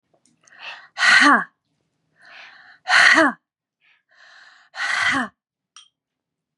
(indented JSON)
{
  "exhalation_length": "6.6 s",
  "exhalation_amplitude": 29743,
  "exhalation_signal_mean_std_ratio": 0.36,
  "survey_phase": "beta (2021-08-13 to 2022-03-07)",
  "age": "18-44",
  "gender": "Female",
  "wearing_mask": "No",
  "symptom_none": true,
  "smoker_status": "Never smoked",
  "respiratory_condition_asthma": false,
  "respiratory_condition_other": false,
  "recruitment_source": "REACT",
  "submission_delay": "1 day",
  "covid_test_result": "Negative",
  "covid_test_method": "RT-qPCR",
  "influenza_a_test_result": "Negative",
  "influenza_b_test_result": "Negative"
}